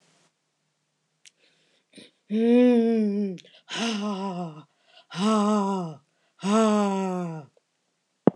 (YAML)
exhalation_length: 8.4 s
exhalation_amplitude: 25630
exhalation_signal_mean_std_ratio: 0.53
survey_phase: beta (2021-08-13 to 2022-03-07)
age: 45-64
gender: Female
wearing_mask: 'No'
symptom_none: true
smoker_status: Never smoked
respiratory_condition_asthma: false
respiratory_condition_other: false
recruitment_source: REACT
submission_delay: 1 day
covid_test_result: Negative
covid_test_method: RT-qPCR